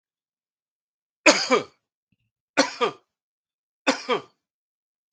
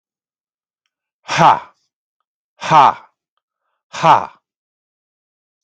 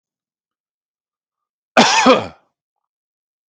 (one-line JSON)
{"three_cough_length": "5.1 s", "three_cough_amplitude": 32768, "three_cough_signal_mean_std_ratio": 0.27, "exhalation_length": "5.6 s", "exhalation_amplitude": 32768, "exhalation_signal_mean_std_ratio": 0.28, "cough_length": "3.5 s", "cough_amplitude": 32768, "cough_signal_mean_std_ratio": 0.28, "survey_phase": "beta (2021-08-13 to 2022-03-07)", "age": "45-64", "gender": "Male", "wearing_mask": "No", "symptom_none": true, "smoker_status": "Ex-smoker", "respiratory_condition_asthma": false, "respiratory_condition_other": false, "recruitment_source": "REACT", "submission_delay": "2 days", "covid_test_result": "Negative", "covid_test_method": "RT-qPCR", "influenza_a_test_result": "Negative", "influenza_b_test_result": "Negative"}